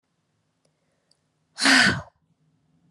{"exhalation_length": "2.9 s", "exhalation_amplitude": 19877, "exhalation_signal_mean_std_ratio": 0.29, "survey_phase": "beta (2021-08-13 to 2022-03-07)", "age": "18-44", "gender": "Female", "wearing_mask": "No", "symptom_fatigue": true, "symptom_headache": true, "symptom_onset": "12 days", "smoker_status": "Never smoked", "respiratory_condition_asthma": false, "respiratory_condition_other": false, "recruitment_source": "REACT", "submission_delay": "1 day", "covid_test_result": "Negative", "covid_test_method": "RT-qPCR"}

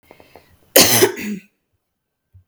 {"cough_length": "2.5 s", "cough_amplitude": 32768, "cough_signal_mean_std_ratio": 0.34, "survey_phase": "beta (2021-08-13 to 2022-03-07)", "age": "45-64", "gender": "Female", "wearing_mask": "No", "symptom_none": true, "smoker_status": "Never smoked", "respiratory_condition_asthma": false, "respiratory_condition_other": false, "recruitment_source": "REACT", "submission_delay": "5 days", "covid_test_result": "Negative", "covid_test_method": "RT-qPCR", "influenza_a_test_result": "Unknown/Void", "influenza_b_test_result": "Unknown/Void"}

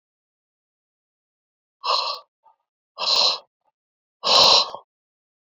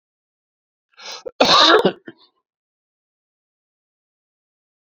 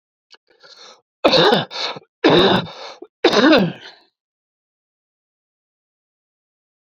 {"exhalation_length": "5.5 s", "exhalation_amplitude": 25355, "exhalation_signal_mean_std_ratio": 0.34, "cough_length": "4.9 s", "cough_amplitude": 28303, "cough_signal_mean_std_ratio": 0.26, "three_cough_length": "6.9 s", "three_cough_amplitude": 32768, "three_cough_signal_mean_std_ratio": 0.37, "survey_phase": "beta (2021-08-13 to 2022-03-07)", "age": "65+", "gender": "Male", "wearing_mask": "No", "symptom_none": true, "smoker_status": "Ex-smoker", "respiratory_condition_asthma": false, "respiratory_condition_other": true, "recruitment_source": "Test and Trace", "submission_delay": "1 day", "covid_test_result": "Positive", "covid_test_method": "RT-qPCR", "covid_ct_value": 30.2, "covid_ct_gene": "ORF1ab gene", "covid_ct_mean": 30.7, "covid_viral_load": "85 copies/ml", "covid_viral_load_category": "Minimal viral load (< 10K copies/ml)"}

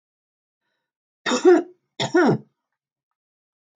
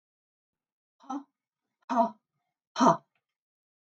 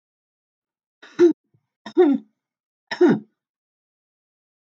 {"cough_length": "3.8 s", "cough_amplitude": 20650, "cough_signal_mean_std_ratio": 0.33, "exhalation_length": "3.8 s", "exhalation_amplitude": 12816, "exhalation_signal_mean_std_ratio": 0.25, "three_cough_length": "4.7 s", "three_cough_amplitude": 16256, "three_cough_signal_mean_std_ratio": 0.29, "survey_phase": "beta (2021-08-13 to 2022-03-07)", "age": "45-64", "gender": "Female", "wearing_mask": "No", "symptom_none": true, "smoker_status": "Never smoked", "respiratory_condition_asthma": false, "respiratory_condition_other": false, "recruitment_source": "REACT", "submission_delay": "1 day", "covid_test_result": "Negative", "covid_test_method": "RT-qPCR"}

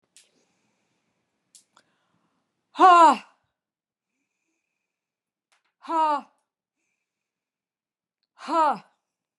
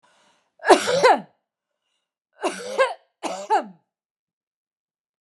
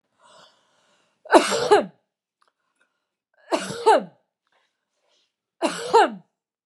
{"exhalation_length": "9.4 s", "exhalation_amplitude": 18155, "exhalation_signal_mean_std_ratio": 0.24, "cough_length": "5.2 s", "cough_amplitude": 32767, "cough_signal_mean_std_ratio": 0.33, "three_cough_length": "6.7 s", "three_cough_amplitude": 32766, "three_cough_signal_mean_std_ratio": 0.3, "survey_phase": "beta (2021-08-13 to 2022-03-07)", "age": "45-64", "gender": "Female", "wearing_mask": "No", "symptom_none": true, "smoker_status": "Ex-smoker", "respiratory_condition_asthma": false, "respiratory_condition_other": false, "recruitment_source": "REACT", "submission_delay": "1 day", "covid_test_result": "Negative", "covid_test_method": "RT-qPCR", "influenza_a_test_result": "Negative", "influenza_b_test_result": "Negative"}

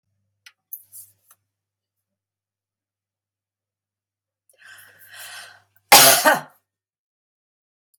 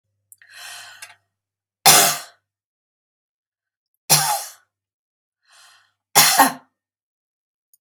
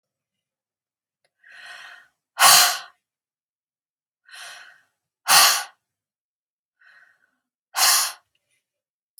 {"cough_length": "8.0 s", "cough_amplitude": 32768, "cough_signal_mean_std_ratio": 0.19, "three_cough_length": "7.8 s", "three_cough_amplitude": 32768, "three_cough_signal_mean_std_ratio": 0.27, "exhalation_length": "9.2 s", "exhalation_amplitude": 32030, "exhalation_signal_mean_std_ratio": 0.27, "survey_phase": "beta (2021-08-13 to 2022-03-07)", "age": "65+", "gender": "Female", "wearing_mask": "No", "symptom_none": true, "smoker_status": "Never smoked", "respiratory_condition_asthma": false, "respiratory_condition_other": false, "recruitment_source": "REACT", "submission_delay": "4 days", "covid_test_result": "Negative", "covid_test_method": "RT-qPCR", "influenza_a_test_result": "Negative", "influenza_b_test_result": "Negative"}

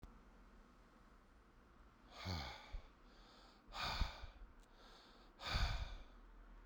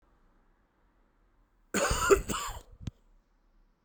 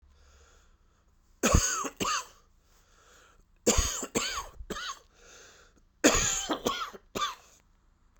{"exhalation_length": "6.7 s", "exhalation_amplitude": 1711, "exhalation_signal_mean_std_ratio": 0.5, "cough_length": "3.8 s", "cough_amplitude": 13206, "cough_signal_mean_std_ratio": 0.33, "three_cough_length": "8.2 s", "three_cough_amplitude": 15923, "three_cough_signal_mean_std_ratio": 0.42, "survey_phase": "beta (2021-08-13 to 2022-03-07)", "age": "45-64", "gender": "Male", "wearing_mask": "No", "symptom_cough_any": true, "symptom_runny_or_blocked_nose": true, "smoker_status": "Ex-smoker", "respiratory_condition_asthma": false, "respiratory_condition_other": false, "recruitment_source": "Test and Trace", "submission_delay": "16 days", "covid_test_result": "Negative", "covid_test_method": "RT-qPCR"}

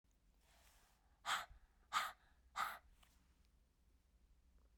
{"exhalation_length": "4.8 s", "exhalation_amplitude": 1359, "exhalation_signal_mean_std_ratio": 0.32, "survey_phase": "beta (2021-08-13 to 2022-03-07)", "age": "45-64", "gender": "Female", "wearing_mask": "No", "symptom_cough_any": true, "symptom_runny_or_blocked_nose": true, "symptom_onset": "5 days", "smoker_status": "Never smoked", "respiratory_condition_asthma": false, "respiratory_condition_other": false, "recruitment_source": "REACT", "submission_delay": "1 day", "covid_test_result": "Negative", "covid_test_method": "RT-qPCR"}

